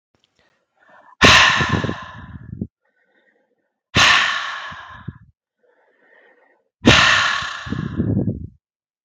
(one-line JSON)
{"exhalation_length": "9.0 s", "exhalation_amplitude": 32768, "exhalation_signal_mean_std_ratio": 0.42, "survey_phase": "beta (2021-08-13 to 2022-03-07)", "age": "18-44", "gender": "Male", "wearing_mask": "No", "symptom_cough_any": true, "symptom_runny_or_blocked_nose": true, "symptom_headache": true, "smoker_status": "Never smoked", "respiratory_condition_asthma": false, "respiratory_condition_other": false, "recruitment_source": "Test and Trace", "submission_delay": "3 days", "covid_test_result": "Positive", "covid_test_method": "RT-qPCR", "covid_ct_value": 17.4, "covid_ct_gene": "ORF1ab gene", "covid_ct_mean": 17.8, "covid_viral_load": "1400000 copies/ml", "covid_viral_load_category": "High viral load (>1M copies/ml)"}